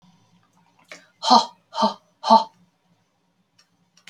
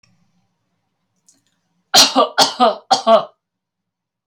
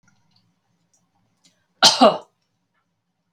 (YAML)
exhalation_length: 4.1 s
exhalation_amplitude: 27559
exhalation_signal_mean_std_ratio: 0.27
three_cough_length: 4.3 s
three_cough_amplitude: 32768
three_cough_signal_mean_std_ratio: 0.35
cough_length: 3.3 s
cough_amplitude: 32768
cough_signal_mean_std_ratio: 0.22
survey_phase: alpha (2021-03-01 to 2021-08-12)
age: 45-64
gender: Female
wearing_mask: 'No'
symptom_none: true
smoker_status: Never smoked
respiratory_condition_asthma: false
respiratory_condition_other: false
recruitment_source: REACT
submission_delay: 1 day
covid_test_result: Negative
covid_test_method: RT-qPCR